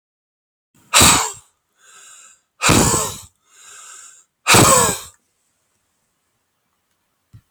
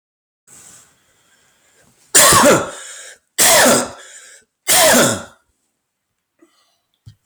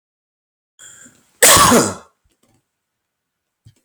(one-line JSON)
{"exhalation_length": "7.5 s", "exhalation_amplitude": 32768, "exhalation_signal_mean_std_ratio": 0.35, "three_cough_length": "7.3 s", "three_cough_amplitude": 32765, "three_cough_signal_mean_std_ratio": 0.43, "cough_length": "3.8 s", "cough_amplitude": 32768, "cough_signal_mean_std_ratio": 0.31, "survey_phase": "beta (2021-08-13 to 2022-03-07)", "age": "45-64", "gender": "Male", "wearing_mask": "No", "symptom_none": true, "smoker_status": "Ex-smoker", "respiratory_condition_asthma": false, "respiratory_condition_other": false, "recruitment_source": "REACT", "submission_delay": "2 days", "covid_test_result": "Negative", "covid_test_method": "RT-qPCR", "influenza_a_test_result": "Negative", "influenza_b_test_result": "Negative"}